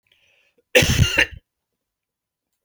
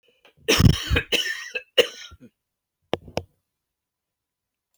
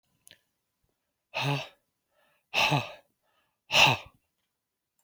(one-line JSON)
{"cough_length": "2.6 s", "cough_amplitude": 31232, "cough_signal_mean_std_ratio": 0.33, "three_cough_length": "4.8 s", "three_cough_amplitude": 24805, "three_cough_signal_mean_std_ratio": 0.31, "exhalation_length": "5.0 s", "exhalation_amplitude": 17173, "exhalation_signal_mean_std_ratio": 0.31, "survey_phase": "beta (2021-08-13 to 2022-03-07)", "age": "45-64", "gender": "Male", "wearing_mask": "No", "symptom_fatigue": true, "symptom_headache": true, "symptom_onset": "5 days", "smoker_status": "Never smoked", "respiratory_condition_asthma": false, "respiratory_condition_other": false, "recruitment_source": "Test and Trace", "submission_delay": "2 days", "covid_test_result": "Positive", "covid_test_method": "RT-qPCR", "covid_ct_value": 15.4, "covid_ct_gene": "ORF1ab gene", "covid_ct_mean": 16.0, "covid_viral_load": "5500000 copies/ml", "covid_viral_load_category": "High viral load (>1M copies/ml)"}